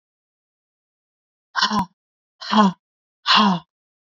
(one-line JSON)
{"exhalation_length": "4.1 s", "exhalation_amplitude": 27188, "exhalation_signal_mean_std_ratio": 0.36, "survey_phase": "beta (2021-08-13 to 2022-03-07)", "age": "18-44", "gender": "Female", "wearing_mask": "No", "symptom_cough_any": true, "symptom_runny_or_blocked_nose": true, "symptom_onset": "4 days", "smoker_status": "Ex-smoker", "respiratory_condition_asthma": false, "respiratory_condition_other": false, "recruitment_source": "REACT", "submission_delay": "4 days", "covid_test_result": "Negative", "covid_test_method": "RT-qPCR", "influenza_a_test_result": "Negative", "influenza_b_test_result": "Negative"}